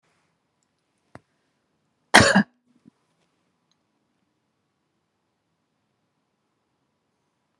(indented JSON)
{
  "cough_length": "7.6 s",
  "cough_amplitude": 32768,
  "cough_signal_mean_std_ratio": 0.14,
  "survey_phase": "beta (2021-08-13 to 2022-03-07)",
  "age": "45-64",
  "gender": "Female",
  "wearing_mask": "No",
  "symptom_none": true,
  "smoker_status": "Never smoked",
  "respiratory_condition_asthma": false,
  "respiratory_condition_other": false,
  "recruitment_source": "REACT",
  "submission_delay": "1 day",
  "covid_test_result": "Negative",
  "covid_test_method": "RT-qPCR"
}